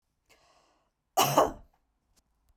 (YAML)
cough_length: 2.6 s
cough_amplitude: 13200
cough_signal_mean_std_ratio: 0.27
survey_phase: beta (2021-08-13 to 2022-03-07)
age: 45-64
gender: Female
wearing_mask: 'No'
symptom_sore_throat: true
symptom_onset: 12 days
smoker_status: Never smoked
respiratory_condition_asthma: false
respiratory_condition_other: false
recruitment_source: REACT
submission_delay: 1 day
covid_test_result: Negative
covid_test_method: RT-qPCR
influenza_a_test_result: Negative
influenza_b_test_result: Negative